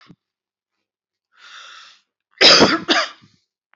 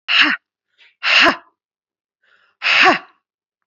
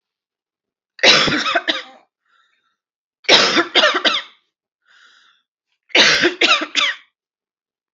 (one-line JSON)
{"cough_length": "3.8 s", "cough_amplitude": 32004, "cough_signal_mean_std_ratio": 0.31, "exhalation_length": "3.7 s", "exhalation_amplitude": 32767, "exhalation_signal_mean_std_ratio": 0.41, "three_cough_length": "7.9 s", "three_cough_amplitude": 32768, "three_cough_signal_mean_std_ratio": 0.42, "survey_phase": "beta (2021-08-13 to 2022-03-07)", "age": "18-44", "gender": "Female", "wearing_mask": "No", "symptom_cough_any": true, "symptom_sore_throat": true, "symptom_onset": "4 days", "smoker_status": "Never smoked", "respiratory_condition_asthma": false, "respiratory_condition_other": false, "recruitment_source": "Test and Trace", "submission_delay": "1 day", "covid_test_result": "Positive", "covid_test_method": "ePCR"}